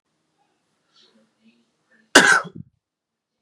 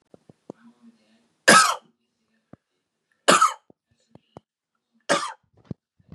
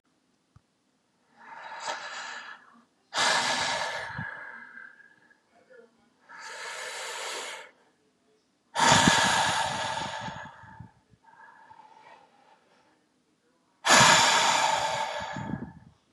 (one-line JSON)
{"cough_length": "3.4 s", "cough_amplitude": 32768, "cough_signal_mean_std_ratio": 0.21, "three_cough_length": "6.1 s", "three_cough_amplitude": 32492, "three_cough_signal_mean_std_ratio": 0.25, "exhalation_length": "16.1 s", "exhalation_amplitude": 20806, "exhalation_signal_mean_std_ratio": 0.44, "survey_phase": "beta (2021-08-13 to 2022-03-07)", "age": "18-44", "gender": "Male", "wearing_mask": "No", "symptom_none": true, "symptom_onset": "13 days", "smoker_status": "Prefer not to say", "respiratory_condition_asthma": false, "respiratory_condition_other": false, "recruitment_source": "REACT", "submission_delay": "3 days", "covid_test_result": "Negative", "covid_test_method": "RT-qPCR", "influenza_a_test_result": "Negative", "influenza_b_test_result": "Negative"}